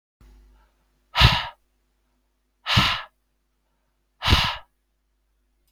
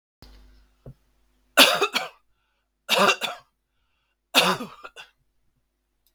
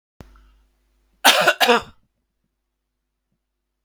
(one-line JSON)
{"exhalation_length": "5.7 s", "exhalation_amplitude": 32621, "exhalation_signal_mean_std_ratio": 0.3, "three_cough_length": "6.1 s", "three_cough_amplitude": 32624, "three_cough_signal_mean_std_ratio": 0.3, "cough_length": "3.8 s", "cough_amplitude": 32768, "cough_signal_mean_std_ratio": 0.27, "survey_phase": "beta (2021-08-13 to 2022-03-07)", "age": "45-64", "gender": "Male", "wearing_mask": "No", "symptom_none": true, "smoker_status": "Never smoked", "respiratory_condition_asthma": false, "respiratory_condition_other": false, "recruitment_source": "REACT", "submission_delay": "2 days", "covid_test_result": "Negative", "covid_test_method": "RT-qPCR", "influenza_a_test_result": "Negative", "influenza_b_test_result": "Negative"}